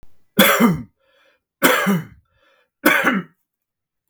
{"three_cough_length": "4.1 s", "three_cough_amplitude": 32768, "three_cough_signal_mean_std_ratio": 0.45, "survey_phase": "beta (2021-08-13 to 2022-03-07)", "age": "45-64", "gender": "Male", "wearing_mask": "No", "symptom_none": true, "smoker_status": "Never smoked", "respiratory_condition_asthma": false, "respiratory_condition_other": false, "recruitment_source": "REACT", "submission_delay": "3 days", "covid_test_result": "Negative", "covid_test_method": "RT-qPCR", "influenza_a_test_result": "Negative", "influenza_b_test_result": "Negative"}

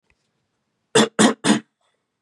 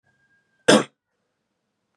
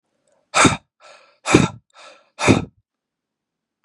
{"three_cough_length": "2.2 s", "three_cough_amplitude": 29483, "three_cough_signal_mean_std_ratio": 0.34, "cough_length": "2.0 s", "cough_amplitude": 31612, "cough_signal_mean_std_ratio": 0.21, "exhalation_length": "3.8 s", "exhalation_amplitude": 32768, "exhalation_signal_mean_std_ratio": 0.3, "survey_phase": "beta (2021-08-13 to 2022-03-07)", "age": "18-44", "gender": "Male", "wearing_mask": "No", "symptom_cough_any": true, "symptom_runny_or_blocked_nose": true, "symptom_headache": true, "smoker_status": "Never smoked", "respiratory_condition_asthma": true, "respiratory_condition_other": false, "recruitment_source": "Test and Trace", "submission_delay": "1 day", "covid_test_result": "Positive", "covid_test_method": "LFT"}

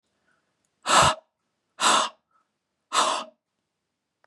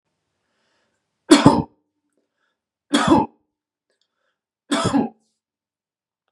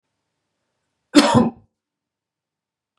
{"exhalation_length": "4.3 s", "exhalation_amplitude": 19025, "exhalation_signal_mean_std_ratio": 0.35, "three_cough_length": "6.3 s", "three_cough_amplitude": 32768, "three_cough_signal_mean_std_ratio": 0.28, "cough_length": "3.0 s", "cough_amplitude": 32767, "cough_signal_mean_std_ratio": 0.26, "survey_phase": "beta (2021-08-13 to 2022-03-07)", "age": "45-64", "gender": "Male", "wearing_mask": "No", "symptom_none": true, "smoker_status": "Never smoked", "respiratory_condition_asthma": false, "respiratory_condition_other": false, "recruitment_source": "REACT", "submission_delay": "6 days", "covid_test_result": "Negative", "covid_test_method": "RT-qPCR", "influenza_a_test_result": "Negative", "influenza_b_test_result": "Negative"}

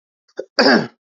{"cough_length": "1.2 s", "cough_amplitude": 30836, "cough_signal_mean_std_ratio": 0.39, "survey_phase": "beta (2021-08-13 to 2022-03-07)", "age": "18-44", "gender": "Male", "wearing_mask": "No", "symptom_none": true, "smoker_status": "Ex-smoker", "respiratory_condition_asthma": false, "respiratory_condition_other": false, "recruitment_source": "REACT", "submission_delay": "2 days", "covid_test_result": "Negative", "covid_test_method": "RT-qPCR"}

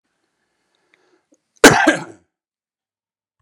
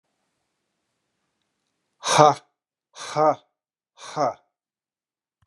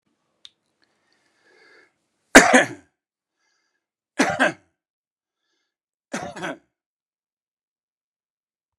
{"cough_length": "3.4 s", "cough_amplitude": 32768, "cough_signal_mean_std_ratio": 0.22, "exhalation_length": "5.5 s", "exhalation_amplitude": 32199, "exhalation_signal_mean_std_ratio": 0.25, "three_cough_length": "8.8 s", "three_cough_amplitude": 32768, "three_cough_signal_mean_std_ratio": 0.19, "survey_phase": "beta (2021-08-13 to 2022-03-07)", "age": "65+", "gender": "Male", "wearing_mask": "No", "symptom_none": true, "smoker_status": "Ex-smoker", "respiratory_condition_asthma": false, "respiratory_condition_other": false, "recruitment_source": "REACT", "submission_delay": "2 days", "covid_test_result": "Negative", "covid_test_method": "RT-qPCR"}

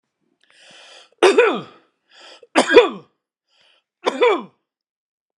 {"three_cough_length": "5.4 s", "three_cough_amplitude": 32767, "three_cough_signal_mean_std_ratio": 0.32, "survey_phase": "beta (2021-08-13 to 2022-03-07)", "age": "45-64", "gender": "Male", "wearing_mask": "No", "symptom_none": true, "smoker_status": "Never smoked", "respiratory_condition_asthma": false, "respiratory_condition_other": false, "recruitment_source": "REACT", "submission_delay": "1 day", "covid_test_result": "Negative", "covid_test_method": "RT-qPCR"}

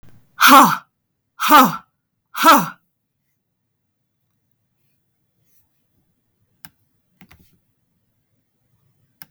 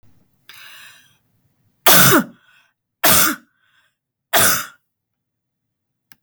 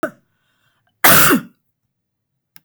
{"exhalation_length": "9.3 s", "exhalation_amplitude": 32768, "exhalation_signal_mean_std_ratio": 0.25, "three_cough_length": "6.2 s", "three_cough_amplitude": 32768, "three_cough_signal_mean_std_ratio": 0.33, "cough_length": "2.6 s", "cough_amplitude": 32768, "cough_signal_mean_std_ratio": 0.33, "survey_phase": "beta (2021-08-13 to 2022-03-07)", "age": "18-44", "gender": "Female", "wearing_mask": "No", "symptom_sore_throat": true, "smoker_status": "Never smoked", "respiratory_condition_asthma": false, "respiratory_condition_other": false, "recruitment_source": "REACT", "submission_delay": "1 day", "covid_test_result": "Negative", "covid_test_method": "RT-qPCR", "influenza_a_test_result": "Negative", "influenza_b_test_result": "Negative"}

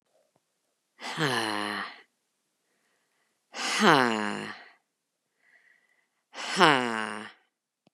{"exhalation_length": "7.9 s", "exhalation_amplitude": 26527, "exhalation_signal_mean_std_ratio": 0.34, "survey_phase": "beta (2021-08-13 to 2022-03-07)", "age": "45-64", "gender": "Female", "wearing_mask": "No", "symptom_none": true, "smoker_status": "Never smoked", "respiratory_condition_asthma": false, "respiratory_condition_other": false, "recruitment_source": "Test and Trace", "submission_delay": "1 day", "covid_test_result": "Negative", "covid_test_method": "LFT"}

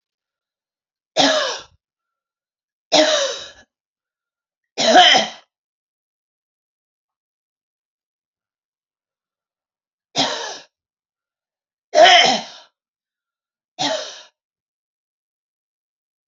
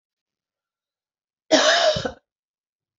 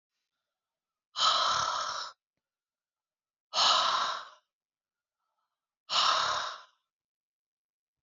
{"three_cough_length": "16.3 s", "three_cough_amplitude": 31851, "three_cough_signal_mean_std_ratio": 0.28, "cough_length": "3.0 s", "cough_amplitude": 25668, "cough_signal_mean_std_ratio": 0.34, "exhalation_length": "8.0 s", "exhalation_amplitude": 7949, "exhalation_signal_mean_std_ratio": 0.42, "survey_phase": "beta (2021-08-13 to 2022-03-07)", "age": "45-64", "gender": "Female", "wearing_mask": "No", "symptom_cough_any": true, "symptom_runny_or_blocked_nose": true, "symptom_sore_throat": true, "symptom_fatigue": true, "symptom_headache": true, "symptom_other": true, "symptom_onset": "3 days", "smoker_status": "Never smoked", "respiratory_condition_asthma": false, "respiratory_condition_other": false, "recruitment_source": "Test and Trace", "submission_delay": "2 days", "covid_test_result": "Positive", "covid_test_method": "RT-qPCR"}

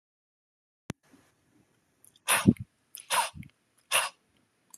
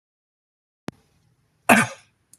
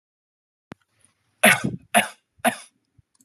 {"exhalation_length": "4.8 s", "exhalation_amplitude": 18280, "exhalation_signal_mean_std_ratio": 0.26, "cough_length": "2.4 s", "cough_amplitude": 30823, "cough_signal_mean_std_ratio": 0.21, "three_cough_length": "3.2 s", "three_cough_amplitude": 28572, "three_cough_signal_mean_std_ratio": 0.27, "survey_phase": "beta (2021-08-13 to 2022-03-07)", "age": "18-44", "gender": "Male", "wearing_mask": "No", "symptom_none": true, "smoker_status": "Never smoked", "respiratory_condition_asthma": false, "respiratory_condition_other": false, "recruitment_source": "REACT", "submission_delay": "1 day", "covid_test_result": "Negative", "covid_test_method": "RT-qPCR", "influenza_a_test_result": "Negative", "influenza_b_test_result": "Negative"}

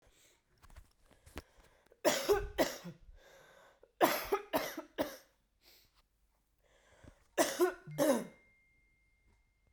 {"three_cough_length": "9.7 s", "three_cough_amplitude": 7496, "three_cough_signal_mean_std_ratio": 0.35, "survey_phase": "beta (2021-08-13 to 2022-03-07)", "age": "18-44", "gender": "Female", "wearing_mask": "No", "symptom_cough_any": true, "symptom_runny_or_blocked_nose": true, "symptom_sore_throat": true, "symptom_fatigue": true, "symptom_headache": true, "symptom_change_to_sense_of_smell_or_taste": true, "symptom_onset": "3 days", "smoker_status": "Never smoked", "respiratory_condition_asthma": false, "respiratory_condition_other": false, "recruitment_source": "Test and Trace", "submission_delay": "1 day", "covid_test_result": "Positive", "covid_test_method": "RT-qPCR", "covid_ct_value": 18.6, "covid_ct_gene": "ORF1ab gene"}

